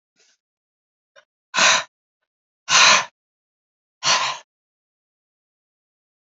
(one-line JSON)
{"exhalation_length": "6.2 s", "exhalation_amplitude": 28369, "exhalation_signal_mean_std_ratio": 0.29, "survey_phase": "beta (2021-08-13 to 2022-03-07)", "age": "65+", "gender": "Female", "wearing_mask": "No", "symptom_cough_any": true, "symptom_runny_or_blocked_nose": true, "symptom_change_to_sense_of_smell_or_taste": true, "smoker_status": "Never smoked", "respiratory_condition_asthma": false, "respiratory_condition_other": false, "recruitment_source": "Test and Trace", "submission_delay": "2 days", "covid_test_result": "Positive", "covid_test_method": "RT-qPCR", "covid_ct_value": 14.8, "covid_ct_gene": "ORF1ab gene", "covid_ct_mean": 15.1, "covid_viral_load": "11000000 copies/ml", "covid_viral_load_category": "High viral load (>1M copies/ml)"}